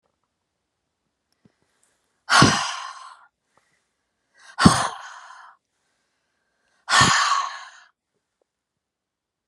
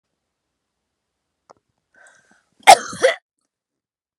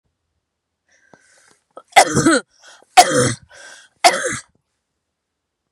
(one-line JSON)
{"exhalation_length": "9.5 s", "exhalation_amplitude": 32768, "exhalation_signal_mean_std_ratio": 0.29, "cough_length": "4.2 s", "cough_amplitude": 32768, "cough_signal_mean_std_ratio": 0.17, "three_cough_length": "5.7 s", "three_cough_amplitude": 32768, "three_cough_signal_mean_std_ratio": 0.31, "survey_phase": "beta (2021-08-13 to 2022-03-07)", "age": "45-64", "gender": "Female", "wearing_mask": "No", "symptom_none": true, "smoker_status": "Never smoked", "respiratory_condition_asthma": false, "respiratory_condition_other": false, "recruitment_source": "REACT", "submission_delay": "1 day", "covid_test_result": "Negative", "covid_test_method": "RT-qPCR"}